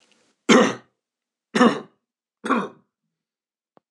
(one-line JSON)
{"three_cough_length": "3.9 s", "three_cough_amplitude": 25584, "three_cough_signal_mean_std_ratio": 0.31, "survey_phase": "beta (2021-08-13 to 2022-03-07)", "age": "45-64", "gender": "Male", "wearing_mask": "No", "symptom_none": true, "smoker_status": "Never smoked", "respiratory_condition_asthma": false, "respiratory_condition_other": false, "recruitment_source": "REACT", "submission_delay": "4 days", "covid_test_result": "Negative", "covid_test_method": "RT-qPCR", "influenza_a_test_result": "Negative", "influenza_b_test_result": "Negative"}